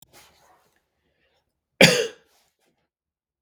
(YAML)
cough_length: 3.4 s
cough_amplitude: 32768
cough_signal_mean_std_ratio: 0.19
survey_phase: beta (2021-08-13 to 2022-03-07)
age: 18-44
gender: Male
wearing_mask: 'No'
symptom_cough_any: true
symptom_runny_or_blocked_nose: true
symptom_shortness_of_breath: true
symptom_fatigue: true
symptom_headache: true
symptom_change_to_sense_of_smell_or_taste: true
symptom_loss_of_taste: true
symptom_onset: 5 days
smoker_status: Never smoked
respiratory_condition_asthma: false
respiratory_condition_other: false
recruitment_source: Test and Trace
submission_delay: 5 days
covid_test_result: Positive
covid_test_method: RT-qPCR
covid_ct_value: 17.6
covid_ct_gene: ORF1ab gene
covid_ct_mean: 18.4
covid_viral_load: 910000 copies/ml
covid_viral_load_category: Low viral load (10K-1M copies/ml)